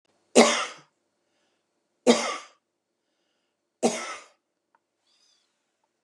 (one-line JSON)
{"three_cough_length": "6.0 s", "three_cough_amplitude": 26683, "three_cough_signal_mean_std_ratio": 0.24, "survey_phase": "beta (2021-08-13 to 2022-03-07)", "age": "65+", "gender": "Female", "wearing_mask": "No", "symptom_none": true, "smoker_status": "Ex-smoker", "respiratory_condition_asthma": false, "respiratory_condition_other": true, "recruitment_source": "REACT", "submission_delay": "1 day", "covid_test_result": "Negative", "covid_test_method": "RT-qPCR", "influenza_a_test_result": "Negative", "influenza_b_test_result": "Negative"}